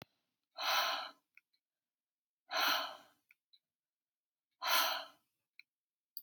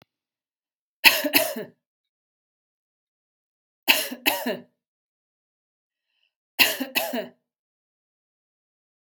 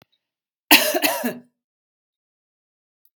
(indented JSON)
{
  "exhalation_length": "6.2 s",
  "exhalation_amplitude": 4490,
  "exhalation_signal_mean_std_ratio": 0.37,
  "three_cough_length": "9.0 s",
  "three_cough_amplitude": 32768,
  "three_cough_signal_mean_std_ratio": 0.26,
  "cough_length": "3.2 s",
  "cough_amplitude": 32768,
  "cough_signal_mean_std_ratio": 0.28,
  "survey_phase": "beta (2021-08-13 to 2022-03-07)",
  "age": "45-64",
  "gender": "Female",
  "wearing_mask": "No",
  "symptom_none": true,
  "smoker_status": "Never smoked",
  "respiratory_condition_asthma": false,
  "respiratory_condition_other": false,
  "recruitment_source": "REACT",
  "submission_delay": "1 day",
  "covid_test_result": "Negative",
  "covid_test_method": "RT-qPCR",
  "influenza_a_test_result": "Negative",
  "influenza_b_test_result": "Negative"
}